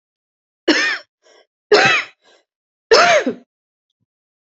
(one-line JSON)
{"three_cough_length": "4.5 s", "three_cough_amplitude": 31272, "three_cough_signal_mean_std_ratio": 0.38, "survey_phase": "beta (2021-08-13 to 2022-03-07)", "age": "18-44", "gender": "Female", "wearing_mask": "No", "symptom_cough_any": true, "symptom_runny_or_blocked_nose": true, "symptom_shortness_of_breath": true, "symptom_fatigue": true, "symptom_headache": true, "smoker_status": "Never smoked", "respiratory_condition_asthma": true, "respiratory_condition_other": true, "recruitment_source": "Test and Trace", "submission_delay": "2 days", "covid_test_result": "Positive", "covid_test_method": "RT-qPCR", "covid_ct_value": 31.6, "covid_ct_gene": "ORF1ab gene", "covid_ct_mean": 32.4, "covid_viral_load": "24 copies/ml", "covid_viral_load_category": "Minimal viral load (< 10K copies/ml)"}